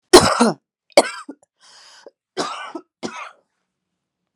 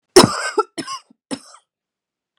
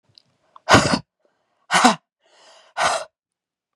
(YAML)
three_cough_length: 4.4 s
three_cough_amplitude: 32768
three_cough_signal_mean_std_ratio: 0.27
cough_length: 2.4 s
cough_amplitude: 32768
cough_signal_mean_std_ratio: 0.28
exhalation_length: 3.8 s
exhalation_amplitude: 32768
exhalation_signal_mean_std_ratio: 0.33
survey_phase: beta (2021-08-13 to 2022-03-07)
age: 18-44
gender: Female
wearing_mask: 'No'
symptom_cough_any: true
symptom_runny_or_blocked_nose: true
symptom_sore_throat: true
symptom_fatigue: true
symptom_headache: true
smoker_status: Ex-smoker
respiratory_condition_asthma: false
respiratory_condition_other: false
recruitment_source: Test and Trace
submission_delay: 2 days
covid_test_result: Positive
covid_test_method: RT-qPCR
covid_ct_value: 27.8
covid_ct_gene: ORF1ab gene
covid_ct_mean: 28.4
covid_viral_load: 490 copies/ml
covid_viral_load_category: Minimal viral load (< 10K copies/ml)